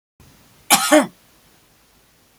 {"cough_length": "2.4 s", "cough_amplitude": 32768, "cough_signal_mean_std_ratio": 0.29, "survey_phase": "beta (2021-08-13 to 2022-03-07)", "age": "65+", "gender": "Female", "wearing_mask": "No", "symptom_none": true, "smoker_status": "Ex-smoker", "respiratory_condition_asthma": false, "respiratory_condition_other": false, "recruitment_source": "REACT", "submission_delay": "2 days", "covid_test_result": "Negative", "covid_test_method": "RT-qPCR", "influenza_a_test_result": "Negative", "influenza_b_test_result": "Negative"}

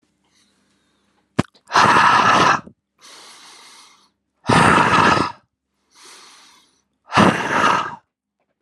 {"exhalation_length": "8.6 s", "exhalation_amplitude": 32052, "exhalation_signal_mean_std_ratio": 0.45, "survey_phase": "alpha (2021-03-01 to 2021-08-12)", "age": "18-44", "gender": "Male", "wearing_mask": "No", "symptom_change_to_sense_of_smell_or_taste": true, "symptom_loss_of_taste": true, "symptom_onset": "6 days", "smoker_status": "Ex-smoker", "respiratory_condition_asthma": false, "respiratory_condition_other": false, "recruitment_source": "Test and Trace", "submission_delay": "1 day", "covid_test_result": "Positive", "covid_test_method": "RT-qPCR", "covid_ct_value": 21.2, "covid_ct_gene": "N gene"}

